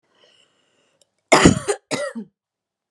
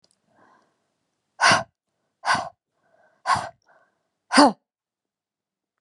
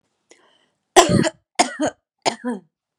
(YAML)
cough_length: 2.9 s
cough_amplitude: 32768
cough_signal_mean_std_ratio: 0.29
exhalation_length: 5.8 s
exhalation_amplitude: 29258
exhalation_signal_mean_std_ratio: 0.26
three_cough_length: 3.0 s
three_cough_amplitude: 32768
three_cough_signal_mean_std_ratio: 0.34
survey_phase: beta (2021-08-13 to 2022-03-07)
age: 18-44
gender: Female
wearing_mask: 'No'
symptom_headache: true
symptom_onset: 7 days
smoker_status: Ex-smoker
respiratory_condition_asthma: false
respiratory_condition_other: false
recruitment_source: REACT
submission_delay: 5 days
covid_test_result: Negative
covid_test_method: RT-qPCR
influenza_a_test_result: Negative
influenza_b_test_result: Negative